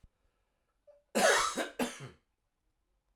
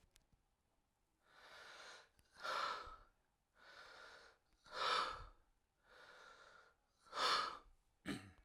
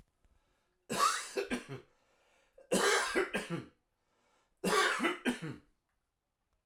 cough_length: 3.2 s
cough_amplitude: 6906
cough_signal_mean_std_ratio: 0.36
exhalation_length: 8.4 s
exhalation_amplitude: 1657
exhalation_signal_mean_std_ratio: 0.4
three_cough_length: 6.7 s
three_cough_amplitude: 4662
three_cough_signal_mean_std_ratio: 0.47
survey_phase: alpha (2021-03-01 to 2021-08-12)
age: 45-64
gender: Male
wearing_mask: 'No'
symptom_none: true
smoker_status: Ex-smoker
respiratory_condition_asthma: false
respiratory_condition_other: false
recruitment_source: REACT
submission_delay: 2 days
covid_test_result: Negative
covid_test_method: RT-qPCR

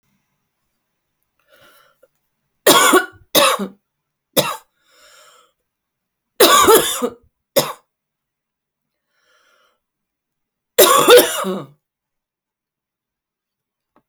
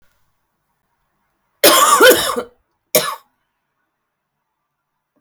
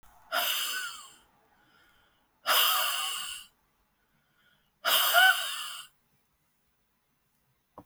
three_cough_length: 14.1 s
three_cough_amplitude: 32768
three_cough_signal_mean_std_ratio: 0.31
cough_length: 5.2 s
cough_amplitude: 32768
cough_signal_mean_std_ratio: 0.32
exhalation_length: 7.9 s
exhalation_amplitude: 13691
exhalation_signal_mean_std_ratio: 0.41
survey_phase: alpha (2021-03-01 to 2021-08-12)
age: 45-64
gender: Female
wearing_mask: 'No'
symptom_cough_any: true
symptom_shortness_of_breath: true
symptom_fatigue: true
symptom_headache: true
symptom_change_to_sense_of_smell_or_taste: true
symptom_loss_of_taste: true
symptom_onset: 5 days
smoker_status: Ex-smoker
respiratory_condition_asthma: false
respiratory_condition_other: false
recruitment_source: Test and Trace
submission_delay: 2 days
covid_test_result: Positive
covid_test_method: RT-qPCR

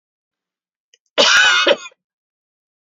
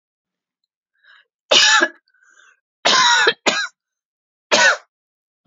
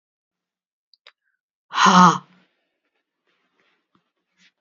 cough_length: 2.8 s
cough_amplitude: 31408
cough_signal_mean_std_ratio: 0.38
three_cough_length: 5.5 s
three_cough_amplitude: 31260
three_cough_signal_mean_std_ratio: 0.4
exhalation_length: 4.6 s
exhalation_amplitude: 28884
exhalation_signal_mean_std_ratio: 0.23
survey_phase: beta (2021-08-13 to 2022-03-07)
age: 45-64
gender: Female
wearing_mask: 'No'
symptom_none: true
smoker_status: Never smoked
respiratory_condition_asthma: false
respiratory_condition_other: false
recruitment_source: REACT
submission_delay: 1 day
covid_test_result: Negative
covid_test_method: RT-qPCR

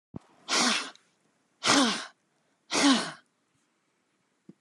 exhalation_length: 4.6 s
exhalation_amplitude: 16865
exhalation_signal_mean_std_ratio: 0.4
survey_phase: alpha (2021-03-01 to 2021-08-12)
age: 65+
gender: Female
wearing_mask: 'No'
symptom_none: true
smoker_status: Never smoked
respiratory_condition_asthma: false
respiratory_condition_other: false
recruitment_source: REACT
submission_delay: 1 day
covid_test_result: Negative
covid_test_method: RT-qPCR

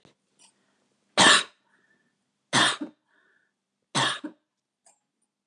three_cough_length: 5.5 s
three_cough_amplitude: 23921
three_cough_signal_mean_std_ratio: 0.28
survey_phase: beta (2021-08-13 to 2022-03-07)
age: 65+
gender: Female
wearing_mask: 'No'
symptom_none: true
smoker_status: Never smoked
respiratory_condition_asthma: false
respiratory_condition_other: false
recruitment_source: REACT
submission_delay: 1 day
covid_test_result: Negative
covid_test_method: RT-qPCR
influenza_a_test_result: Negative
influenza_b_test_result: Negative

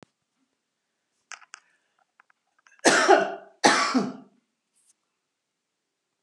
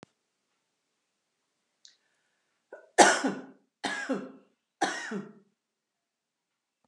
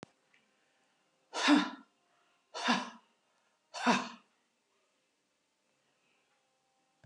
cough_length: 6.2 s
cough_amplitude: 28951
cough_signal_mean_std_ratio: 0.29
three_cough_length: 6.9 s
three_cough_amplitude: 23843
three_cough_signal_mean_std_ratio: 0.24
exhalation_length: 7.1 s
exhalation_amplitude: 6125
exhalation_signal_mean_std_ratio: 0.27
survey_phase: beta (2021-08-13 to 2022-03-07)
age: 65+
gender: Female
wearing_mask: 'No'
symptom_none: true
smoker_status: Ex-smoker
respiratory_condition_asthma: true
respiratory_condition_other: false
recruitment_source: REACT
submission_delay: 1 day
covid_test_result: Negative
covid_test_method: RT-qPCR
influenza_a_test_result: Unknown/Void
influenza_b_test_result: Unknown/Void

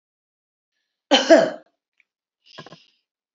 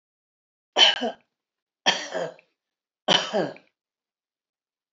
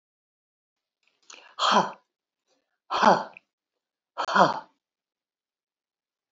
cough_length: 3.3 s
cough_amplitude: 27429
cough_signal_mean_std_ratio: 0.24
three_cough_length: 4.9 s
three_cough_amplitude: 24864
three_cough_signal_mean_std_ratio: 0.31
exhalation_length: 6.3 s
exhalation_amplitude: 24872
exhalation_signal_mean_std_ratio: 0.28
survey_phase: beta (2021-08-13 to 2022-03-07)
age: 65+
gender: Female
wearing_mask: 'No'
symptom_none: true
smoker_status: Never smoked
respiratory_condition_asthma: false
respiratory_condition_other: false
recruitment_source: REACT
submission_delay: 4 days
covid_test_result: Negative
covid_test_method: RT-qPCR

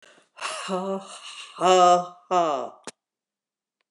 exhalation_length: 3.9 s
exhalation_amplitude: 15183
exhalation_signal_mean_std_ratio: 0.46
survey_phase: beta (2021-08-13 to 2022-03-07)
age: 65+
gender: Female
wearing_mask: 'No'
symptom_none: true
smoker_status: Never smoked
respiratory_condition_asthma: false
respiratory_condition_other: false
recruitment_source: REACT
submission_delay: 2 days
covid_test_result: Negative
covid_test_method: RT-qPCR
influenza_a_test_result: Negative
influenza_b_test_result: Negative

